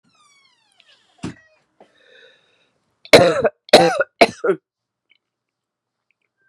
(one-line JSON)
{"cough_length": "6.5 s", "cough_amplitude": 32768, "cough_signal_mean_std_ratio": 0.26, "survey_phase": "beta (2021-08-13 to 2022-03-07)", "age": "45-64", "gender": "Female", "wearing_mask": "No", "symptom_cough_any": true, "symptom_runny_or_blocked_nose": true, "symptom_sore_throat": true, "symptom_fatigue": true, "symptom_fever_high_temperature": true, "symptom_headache": true, "symptom_onset": "3 days", "smoker_status": "Never smoked", "respiratory_condition_asthma": false, "respiratory_condition_other": false, "recruitment_source": "Test and Trace", "submission_delay": "1 day", "covid_test_result": "Positive", "covid_test_method": "RT-qPCR"}